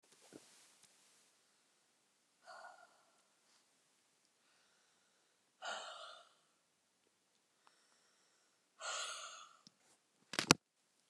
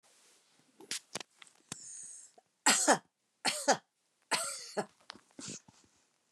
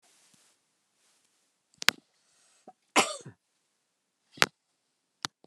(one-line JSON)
{"exhalation_length": "11.1 s", "exhalation_amplitude": 17405, "exhalation_signal_mean_std_ratio": 0.17, "three_cough_length": "6.3 s", "three_cough_amplitude": 8573, "three_cough_signal_mean_std_ratio": 0.32, "cough_length": "5.5 s", "cough_amplitude": 32768, "cough_signal_mean_std_ratio": 0.13, "survey_phase": "beta (2021-08-13 to 2022-03-07)", "age": "65+", "gender": "Female", "wearing_mask": "No", "symptom_none": true, "smoker_status": "Never smoked", "respiratory_condition_asthma": false, "respiratory_condition_other": false, "recruitment_source": "REACT", "submission_delay": "2 days", "covid_test_result": "Negative", "covid_test_method": "RT-qPCR"}